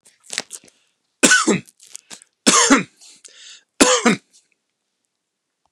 three_cough_length: 5.7 s
three_cough_amplitude: 31181
three_cough_signal_mean_std_ratio: 0.34
survey_phase: beta (2021-08-13 to 2022-03-07)
age: 45-64
gender: Male
wearing_mask: 'No'
symptom_none: true
smoker_status: Never smoked
respiratory_condition_asthma: false
respiratory_condition_other: false
recruitment_source: REACT
submission_delay: 2 days
covid_test_result: Negative
covid_test_method: RT-qPCR
influenza_a_test_result: Negative
influenza_b_test_result: Negative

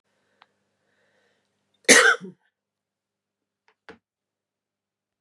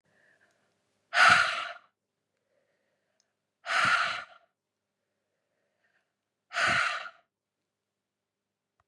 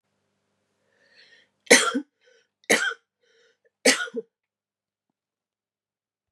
cough_length: 5.2 s
cough_amplitude: 32768
cough_signal_mean_std_ratio: 0.18
exhalation_length: 8.9 s
exhalation_amplitude: 13189
exhalation_signal_mean_std_ratio: 0.31
three_cough_length: 6.3 s
three_cough_amplitude: 30847
three_cough_signal_mean_std_ratio: 0.23
survey_phase: beta (2021-08-13 to 2022-03-07)
age: 45-64
gender: Female
wearing_mask: 'No'
symptom_runny_or_blocked_nose: true
symptom_fatigue: true
smoker_status: Ex-smoker
respiratory_condition_asthma: false
respiratory_condition_other: false
recruitment_source: Test and Trace
submission_delay: 2 days
covid_test_result: Positive
covid_test_method: RT-qPCR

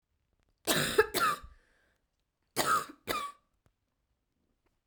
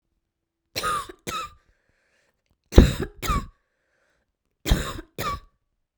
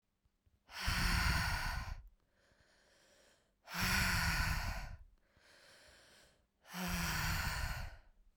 cough_length: 4.9 s
cough_amplitude: 8552
cough_signal_mean_std_ratio: 0.36
three_cough_length: 6.0 s
three_cough_amplitude: 32767
three_cough_signal_mean_std_ratio: 0.27
exhalation_length: 8.4 s
exhalation_amplitude: 2783
exhalation_signal_mean_std_ratio: 0.59
survey_phase: beta (2021-08-13 to 2022-03-07)
age: 18-44
gender: Female
wearing_mask: 'No'
symptom_cough_any: true
symptom_runny_or_blocked_nose: true
symptom_fatigue: true
symptom_fever_high_temperature: true
symptom_headache: true
symptom_onset: 3 days
smoker_status: Never smoked
respiratory_condition_asthma: false
respiratory_condition_other: false
recruitment_source: Test and Trace
submission_delay: 2 days
covid_test_result: Positive
covid_test_method: RT-qPCR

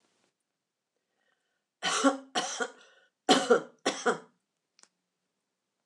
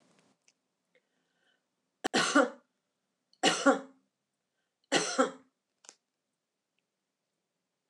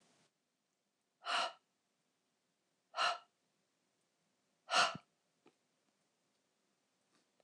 cough_length: 5.9 s
cough_amplitude: 12027
cough_signal_mean_std_ratio: 0.31
three_cough_length: 7.9 s
three_cough_amplitude: 9747
three_cough_signal_mean_std_ratio: 0.26
exhalation_length: 7.4 s
exhalation_amplitude: 3985
exhalation_signal_mean_std_ratio: 0.24
survey_phase: beta (2021-08-13 to 2022-03-07)
age: 65+
gender: Female
wearing_mask: 'No'
symptom_none: true
smoker_status: Never smoked
respiratory_condition_asthma: false
respiratory_condition_other: false
recruitment_source: REACT
submission_delay: 2 days
covid_test_result: Negative
covid_test_method: RT-qPCR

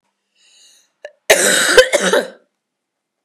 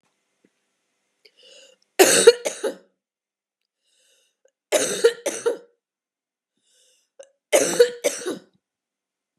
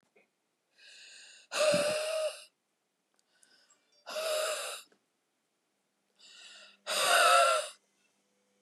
cough_length: 3.2 s
cough_amplitude: 32768
cough_signal_mean_std_ratio: 0.41
three_cough_length: 9.4 s
three_cough_amplitude: 32629
three_cough_signal_mean_std_ratio: 0.28
exhalation_length: 8.6 s
exhalation_amplitude: 8066
exhalation_signal_mean_std_ratio: 0.41
survey_phase: beta (2021-08-13 to 2022-03-07)
age: 18-44
gender: Female
wearing_mask: 'No'
symptom_runny_or_blocked_nose: true
symptom_fatigue: true
symptom_headache: true
smoker_status: Ex-smoker
respiratory_condition_asthma: false
respiratory_condition_other: false
recruitment_source: Test and Trace
submission_delay: 2 days
covid_test_result: Positive
covid_test_method: RT-qPCR
covid_ct_value: 20.8
covid_ct_gene: ORF1ab gene
covid_ct_mean: 21.5
covid_viral_load: 90000 copies/ml
covid_viral_load_category: Low viral load (10K-1M copies/ml)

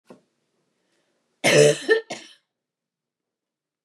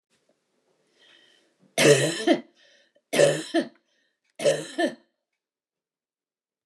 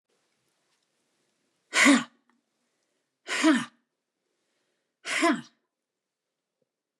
cough_length: 3.8 s
cough_amplitude: 25070
cough_signal_mean_std_ratio: 0.28
three_cough_length: 6.7 s
three_cough_amplitude: 19911
three_cough_signal_mean_std_ratio: 0.34
exhalation_length: 7.0 s
exhalation_amplitude: 16205
exhalation_signal_mean_std_ratio: 0.28
survey_phase: beta (2021-08-13 to 2022-03-07)
age: 65+
gender: Female
wearing_mask: 'No'
symptom_none: true
smoker_status: Ex-smoker
respiratory_condition_asthma: false
respiratory_condition_other: false
recruitment_source: REACT
submission_delay: 4 days
covid_test_result: Negative
covid_test_method: RT-qPCR
influenza_a_test_result: Negative
influenza_b_test_result: Negative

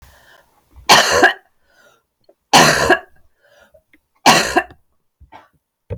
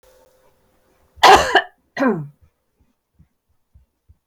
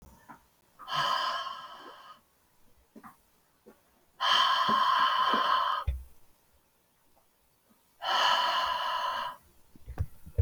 three_cough_length: 6.0 s
three_cough_amplitude: 32768
three_cough_signal_mean_std_ratio: 0.36
cough_length: 4.3 s
cough_amplitude: 31795
cough_signal_mean_std_ratio: 0.27
exhalation_length: 10.4 s
exhalation_amplitude: 8228
exhalation_signal_mean_std_ratio: 0.55
survey_phase: beta (2021-08-13 to 2022-03-07)
age: 45-64
gender: Female
wearing_mask: 'No'
symptom_cough_any: true
symptom_other: true
smoker_status: Ex-smoker
respiratory_condition_asthma: false
respiratory_condition_other: false
recruitment_source: Test and Trace
submission_delay: 2 days
covid_test_result: Positive
covid_test_method: RT-qPCR
covid_ct_value: 21.2
covid_ct_gene: N gene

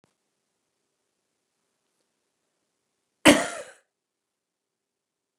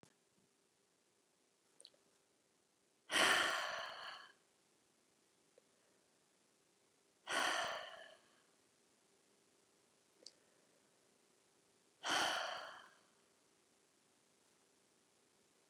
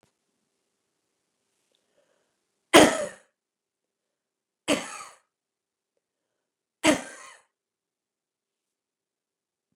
cough_length: 5.4 s
cough_amplitude: 32754
cough_signal_mean_std_ratio: 0.14
exhalation_length: 15.7 s
exhalation_amplitude: 2939
exhalation_signal_mean_std_ratio: 0.29
three_cough_length: 9.8 s
three_cough_amplitude: 31023
three_cough_signal_mean_std_ratio: 0.17
survey_phase: beta (2021-08-13 to 2022-03-07)
age: 65+
gender: Female
wearing_mask: 'No'
symptom_sore_throat: true
smoker_status: Never smoked
respiratory_condition_asthma: true
respiratory_condition_other: false
recruitment_source: REACT
submission_delay: 2 days
covid_test_result: Negative
covid_test_method: RT-qPCR
influenza_a_test_result: Negative
influenza_b_test_result: Negative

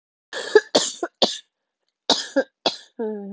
cough_length: 3.3 s
cough_amplitude: 30323
cough_signal_mean_std_ratio: 0.37
survey_phase: beta (2021-08-13 to 2022-03-07)
age: 45-64
gender: Female
wearing_mask: 'No'
symptom_cough_any: true
symptom_runny_or_blocked_nose: true
symptom_shortness_of_breath: true
symptom_sore_throat: true
symptom_abdominal_pain: true
symptom_fever_high_temperature: true
symptom_headache: true
symptom_change_to_sense_of_smell_or_taste: true
symptom_loss_of_taste: true
smoker_status: Never smoked
respiratory_condition_asthma: true
respiratory_condition_other: false
recruitment_source: Test and Trace
submission_delay: 2 days
covid_test_result: Positive
covid_test_method: LFT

